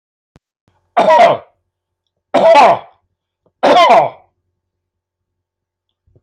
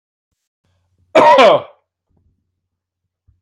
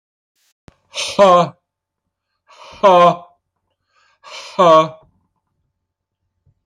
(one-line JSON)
{"three_cough_length": "6.2 s", "three_cough_amplitude": 30061, "three_cough_signal_mean_std_ratio": 0.4, "cough_length": "3.4 s", "cough_amplitude": 29258, "cough_signal_mean_std_ratio": 0.32, "exhalation_length": "6.7 s", "exhalation_amplitude": 28525, "exhalation_signal_mean_std_ratio": 0.33, "survey_phase": "alpha (2021-03-01 to 2021-08-12)", "age": "65+", "gender": "Male", "wearing_mask": "No", "symptom_none": true, "smoker_status": "Never smoked", "respiratory_condition_asthma": false, "respiratory_condition_other": false, "recruitment_source": "REACT", "submission_delay": "2 days", "covid_test_result": "Negative", "covid_test_method": "RT-qPCR"}